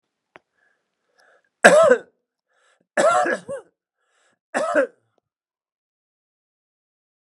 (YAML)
three_cough_length: 7.3 s
three_cough_amplitude: 32768
three_cough_signal_mean_std_ratio: 0.29
survey_phase: beta (2021-08-13 to 2022-03-07)
age: 65+
gender: Male
wearing_mask: 'No'
symptom_none: true
smoker_status: Never smoked
respiratory_condition_asthma: false
respiratory_condition_other: false
recruitment_source: REACT
submission_delay: 1 day
covid_test_result: Negative
covid_test_method: RT-qPCR